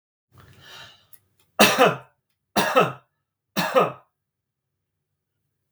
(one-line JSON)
{"three_cough_length": "5.7 s", "three_cough_amplitude": 30382, "three_cough_signal_mean_std_ratio": 0.32, "survey_phase": "beta (2021-08-13 to 2022-03-07)", "age": "45-64", "gender": "Male", "wearing_mask": "No", "symptom_none": true, "smoker_status": "Never smoked", "respiratory_condition_asthma": false, "respiratory_condition_other": false, "recruitment_source": "REACT", "submission_delay": "0 days", "covid_test_result": "Negative", "covid_test_method": "RT-qPCR", "influenza_a_test_result": "Negative", "influenza_b_test_result": "Negative"}